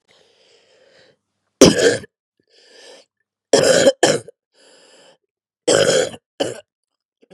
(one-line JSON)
{"three_cough_length": "7.3 s", "three_cough_amplitude": 32768, "three_cough_signal_mean_std_ratio": 0.34, "survey_phase": "beta (2021-08-13 to 2022-03-07)", "age": "45-64", "gender": "Female", "wearing_mask": "No", "symptom_cough_any": true, "symptom_new_continuous_cough": true, "symptom_runny_or_blocked_nose": true, "symptom_abdominal_pain": true, "symptom_fatigue": true, "symptom_headache": true, "symptom_change_to_sense_of_smell_or_taste": true, "symptom_onset": "2 days", "smoker_status": "Never smoked", "respiratory_condition_asthma": true, "respiratory_condition_other": false, "recruitment_source": "Test and Trace", "submission_delay": "1 day", "covid_test_result": "Positive", "covid_test_method": "RT-qPCR", "covid_ct_value": 16.2, "covid_ct_gene": "N gene", "covid_ct_mean": 16.2, "covid_viral_load": "5000000 copies/ml", "covid_viral_load_category": "High viral load (>1M copies/ml)"}